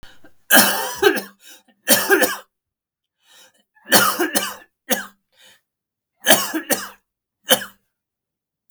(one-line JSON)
{"three_cough_length": "8.7 s", "three_cough_amplitude": 32768, "three_cough_signal_mean_std_ratio": 0.38, "survey_phase": "beta (2021-08-13 to 2022-03-07)", "age": "45-64", "gender": "Male", "wearing_mask": "No", "symptom_cough_any": true, "symptom_sore_throat": true, "smoker_status": "Never smoked", "respiratory_condition_asthma": false, "respiratory_condition_other": false, "recruitment_source": "Test and Trace", "submission_delay": "1 day", "covid_test_result": "Positive", "covid_test_method": "RT-qPCR", "covid_ct_value": 19.3, "covid_ct_gene": "N gene"}